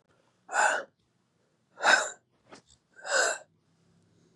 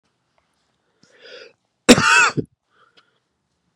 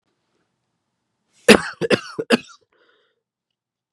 {"exhalation_length": "4.4 s", "exhalation_amplitude": 14138, "exhalation_signal_mean_std_ratio": 0.35, "cough_length": "3.8 s", "cough_amplitude": 32768, "cough_signal_mean_std_ratio": 0.26, "three_cough_length": "3.9 s", "three_cough_amplitude": 32768, "three_cough_signal_mean_std_ratio": 0.21, "survey_phase": "beta (2021-08-13 to 2022-03-07)", "age": "18-44", "gender": "Male", "wearing_mask": "No", "symptom_cough_any": true, "symptom_new_continuous_cough": true, "symptom_runny_or_blocked_nose": true, "symptom_sore_throat": true, "symptom_fatigue": true, "symptom_fever_high_temperature": true, "symptom_headache": true, "symptom_change_to_sense_of_smell_or_taste": true, "smoker_status": "Never smoked", "respiratory_condition_asthma": false, "respiratory_condition_other": false, "recruitment_source": "Test and Trace", "submission_delay": "1 day", "covid_test_result": "Positive", "covid_test_method": "LFT"}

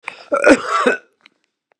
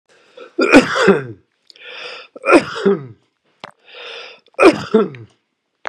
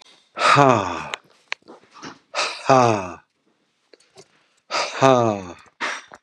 {"cough_length": "1.8 s", "cough_amplitude": 32768, "cough_signal_mean_std_ratio": 0.43, "three_cough_length": "5.9 s", "three_cough_amplitude": 32768, "three_cough_signal_mean_std_ratio": 0.39, "exhalation_length": "6.2 s", "exhalation_amplitude": 32768, "exhalation_signal_mean_std_ratio": 0.4, "survey_phase": "beta (2021-08-13 to 2022-03-07)", "age": "65+", "gender": "Male", "wearing_mask": "No", "symptom_none": true, "smoker_status": "Ex-smoker", "respiratory_condition_asthma": false, "respiratory_condition_other": false, "recruitment_source": "REACT", "submission_delay": "1 day", "covid_test_result": "Negative", "covid_test_method": "RT-qPCR", "influenza_a_test_result": "Negative", "influenza_b_test_result": "Negative"}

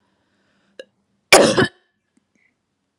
{"cough_length": "3.0 s", "cough_amplitude": 32768, "cough_signal_mean_std_ratio": 0.25, "survey_phase": "beta (2021-08-13 to 2022-03-07)", "age": "45-64", "gender": "Female", "wearing_mask": "No", "symptom_cough_any": true, "symptom_sore_throat": true, "smoker_status": "Never smoked", "respiratory_condition_asthma": false, "respiratory_condition_other": false, "recruitment_source": "Test and Trace", "submission_delay": "2 days", "covid_test_result": "Positive", "covid_test_method": "RT-qPCR"}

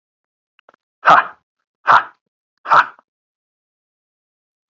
{"exhalation_length": "4.7 s", "exhalation_amplitude": 32768, "exhalation_signal_mean_std_ratio": 0.25, "survey_phase": "beta (2021-08-13 to 2022-03-07)", "age": "45-64", "gender": "Male", "wearing_mask": "No", "symptom_none": true, "smoker_status": "Never smoked", "respiratory_condition_asthma": false, "respiratory_condition_other": false, "recruitment_source": "REACT", "submission_delay": "3 days", "covid_test_result": "Negative", "covid_test_method": "RT-qPCR"}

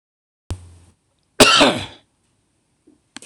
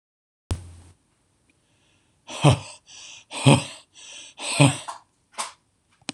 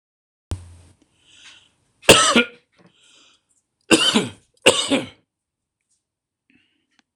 {"cough_length": "3.3 s", "cough_amplitude": 26028, "cough_signal_mean_std_ratio": 0.28, "exhalation_length": "6.1 s", "exhalation_amplitude": 26019, "exhalation_signal_mean_std_ratio": 0.29, "three_cough_length": "7.2 s", "three_cough_amplitude": 26028, "three_cough_signal_mean_std_ratio": 0.28, "survey_phase": "beta (2021-08-13 to 2022-03-07)", "age": "45-64", "gender": "Male", "wearing_mask": "No", "symptom_none": true, "smoker_status": "Never smoked", "respiratory_condition_asthma": true, "respiratory_condition_other": false, "recruitment_source": "REACT", "submission_delay": "3 days", "covid_test_result": "Negative", "covid_test_method": "RT-qPCR", "influenza_a_test_result": "Negative", "influenza_b_test_result": "Negative"}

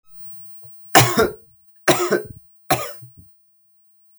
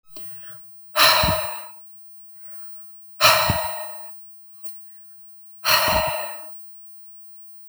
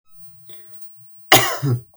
{"three_cough_length": "4.2 s", "three_cough_amplitude": 32768, "three_cough_signal_mean_std_ratio": 0.39, "exhalation_length": "7.7 s", "exhalation_amplitude": 31835, "exhalation_signal_mean_std_ratio": 0.56, "cough_length": "2.0 s", "cough_amplitude": 32768, "cough_signal_mean_std_ratio": 0.42, "survey_phase": "beta (2021-08-13 to 2022-03-07)", "age": "18-44", "gender": "Male", "wearing_mask": "No", "symptom_none": true, "smoker_status": "Never smoked", "respiratory_condition_asthma": false, "respiratory_condition_other": false, "recruitment_source": "REACT", "submission_delay": "1 day", "covid_test_result": "Negative", "covid_test_method": "RT-qPCR", "influenza_a_test_result": "Negative", "influenza_b_test_result": "Negative"}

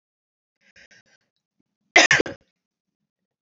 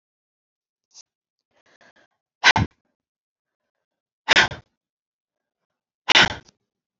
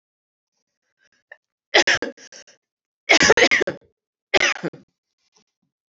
{"cough_length": "3.4 s", "cough_amplitude": 29047, "cough_signal_mean_std_ratio": 0.2, "exhalation_length": "7.0 s", "exhalation_amplitude": 29348, "exhalation_signal_mean_std_ratio": 0.21, "three_cough_length": "5.9 s", "three_cough_amplitude": 32768, "three_cough_signal_mean_std_ratio": 0.3, "survey_phase": "beta (2021-08-13 to 2022-03-07)", "age": "45-64", "gender": "Female", "wearing_mask": "No", "symptom_cough_any": true, "symptom_runny_or_blocked_nose": true, "symptom_sore_throat": true, "symptom_fatigue": true, "symptom_fever_high_temperature": true, "symptom_other": true, "smoker_status": "Never smoked", "respiratory_condition_asthma": false, "respiratory_condition_other": false, "recruitment_source": "Test and Trace", "submission_delay": "1 day", "covid_test_result": "Positive", "covid_test_method": "RT-qPCR"}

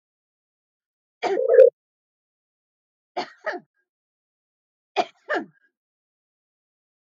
{"three_cough_length": "7.2 s", "three_cough_amplitude": 24211, "three_cough_signal_mean_std_ratio": 0.22, "survey_phase": "alpha (2021-03-01 to 2021-08-12)", "age": "45-64", "gender": "Female", "wearing_mask": "No", "symptom_none": true, "smoker_status": "Ex-smoker", "respiratory_condition_asthma": false, "respiratory_condition_other": false, "recruitment_source": "REACT", "submission_delay": "2 days", "covid_test_result": "Negative", "covid_test_method": "RT-qPCR"}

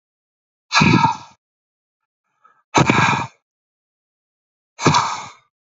{"exhalation_length": "5.7 s", "exhalation_amplitude": 31049, "exhalation_signal_mean_std_ratio": 0.37, "survey_phase": "beta (2021-08-13 to 2022-03-07)", "age": "18-44", "gender": "Male", "wearing_mask": "No", "symptom_cough_any": true, "symptom_runny_or_blocked_nose": true, "symptom_sore_throat": true, "symptom_fatigue": true, "symptom_headache": true, "symptom_onset": "3 days", "smoker_status": "Never smoked", "respiratory_condition_asthma": false, "respiratory_condition_other": false, "recruitment_source": "Test and Trace", "submission_delay": "2 days", "covid_test_result": "Positive", "covid_test_method": "RT-qPCR", "covid_ct_value": 22.9, "covid_ct_gene": "ORF1ab gene"}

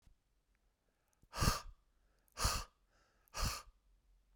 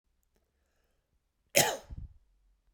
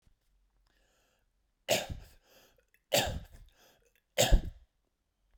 {"exhalation_length": "4.4 s", "exhalation_amplitude": 3985, "exhalation_signal_mean_std_ratio": 0.33, "cough_length": "2.7 s", "cough_amplitude": 16988, "cough_signal_mean_std_ratio": 0.23, "three_cough_length": "5.4 s", "three_cough_amplitude": 8633, "three_cough_signal_mean_std_ratio": 0.27, "survey_phase": "beta (2021-08-13 to 2022-03-07)", "age": "18-44", "gender": "Male", "wearing_mask": "No", "symptom_none": true, "smoker_status": "Never smoked", "respiratory_condition_asthma": false, "respiratory_condition_other": false, "recruitment_source": "REACT", "submission_delay": "2 days", "covid_test_result": "Negative", "covid_test_method": "RT-qPCR"}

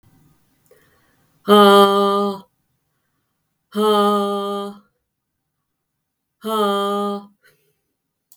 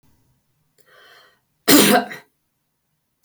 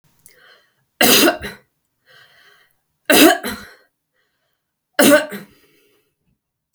{"exhalation_length": "8.4 s", "exhalation_amplitude": 32768, "exhalation_signal_mean_std_ratio": 0.43, "cough_length": "3.2 s", "cough_amplitude": 32768, "cough_signal_mean_std_ratio": 0.28, "three_cough_length": "6.7 s", "three_cough_amplitude": 32768, "three_cough_signal_mean_std_ratio": 0.31, "survey_phase": "beta (2021-08-13 to 2022-03-07)", "age": "18-44", "gender": "Female", "wearing_mask": "No", "symptom_none": true, "smoker_status": "Never smoked", "respiratory_condition_asthma": false, "respiratory_condition_other": false, "recruitment_source": "REACT", "submission_delay": "1 day", "covid_test_result": "Negative", "covid_test_method": "RT-qPCR", "influenza_a_test_result": "Negative", "influenza_b_test_result": "Negative"}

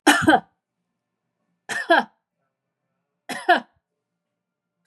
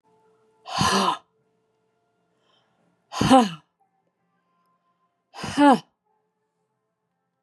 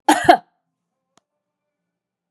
{"three_cough_length": "4.9 s", "three_cough_amplitude": 25668, "three_cough_signal_mean_std_ratio": 0.28, "exhalation_length": "7.4 s", "exhalation_amplitude": 27619, "exhalation_signal_mean_std_ratio": 0.27, "cough_length": "2.3 s", "cough_amplitude": 32768, "cough_signal_mean_std_ratio": 0.23, "survey_phase": "beta (2021-08-13 to 2022-03-07)", "age": "45-64", "gender": "Female", "wearing_mask": "No", "symptom_none": true, "smoker_status": "Never smoked", "respiratory_condition_asthma": false, "respiratory_condition_other": false, "recruitment_source": "REACT", "submission_delay": "4 days", "covid_test_result": "Negative", "covid_test_method": "RT-qPCR", "influenza_a_test_result": "Negative", "influenza_b_test_result": "Negative"}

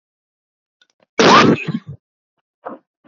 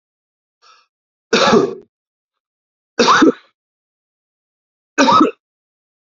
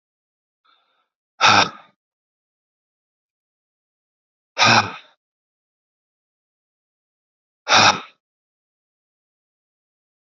{"cough_length": "3.1 s", "cough_amplitude": 29268, "cough_signal_mean_std_ratio": 0.34, "three_cough_length": "6.1 s", "three_cough_amplitude": 31663, "three_cough_signal_mean_std_ratio": 0.34, "exhalation_length": "10.3 s", "exhalation_amplitude": 28608, "exhalation_signal_mean_std_ratio": 0.22, "survey_phase": "beta (2021-08-13 to 2022-03-07)", "age": "45-64", "gender": "Male", "wearing_mask": "No", "symptom_cough_any": true, "symptom_runny_or_blocked_nose": true, "symptom_sore_throat": true, "symptom_fatigue": true, "symptom_headache": true, "symptom_onset": "3 days", "smoker_status": "Ex-smoker", "respiratory_condition_asthma": false, "respiratory_condition_other": false, "recruitment_source": "REACT", "submission_delay": "1 day", "covid_test_result": "Negative", "covid_test_method": "RT-qPCR"}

